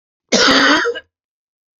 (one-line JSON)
{"cough_length": "1.8 s", "cough_amplitude": 32767, "cough_signal_mean_std_ratio": 0.52, "survey_phase": "beta (2021-08-13 to 2022-03-07)", "age": "65+", "gender": "Male", "wearing_mask": "No", "symptom_cough_any": true, "smoker_status": "Ex-smoker", "respiratory_condition_asthma": true, "respiratory_condition_other": true, "recruitment_source": "REACT", "submission_delay": "2 days", "covid_test_result": "Negative", "covid_test_method": "RT-qPCR"}